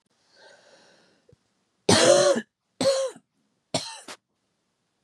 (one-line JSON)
{"three_cough_length": "5.0 s", "three_cough_amplitude": 18373, "three_cough_signal_mean_std_ratio": 0.35, "survey_phase": "beta (2021-08-13 to 2022-03-07)", "age": "45-64", "gender": "Female", "wearing_mask": "No", "symptom_cough_any": true, "symptom_runny_or_blocked_nose": true, "symptom_sore_throat": true, "symptom_fatigue": true, "symptom_fever_high_temperature": true, "symptom_headache": true, "symptom_change_to_sense_of_smell_or_taste": true, "symptom_loss_of_taste": true, "symptom_onset": "5 days", "smoker_status": "Never smoked", "respiratory_condition_asthma": false, "respiratory_condition_other": false, "recruitment_source": "Test and Trace", "submission_delay": "1 day", "covid_test_result": "Positive", "covid_test_method": "RT-qPCR"}